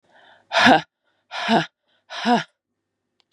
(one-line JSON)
{"exhalation_length": "3.3 s", "exhalation_amplitude": 29949, "exhalation_signal_mean_std_ratio": 0.37, "survey_phase": "beta (2021-08-13 to 2022-03-07)", "age": "18-44", "gender": "Female", "wearing_mask": "No", "symptom_cough_any": true, "symptom_runny_or_blocked_nose": true, "symptom_shortness_of_breath": true, "symptom_fatigue": true, "symptom_headache": true, "symptom_onset": "3 days", "smoker_status": "Never smoked", "respiratory_condition_asthma": false, "respiratory_condition_other": false, "recruitment_source": "Test and Trace", "submission_delay": "2 days", "covid_test_result": "Positive", "covid_test_method": "RT-qPCR"}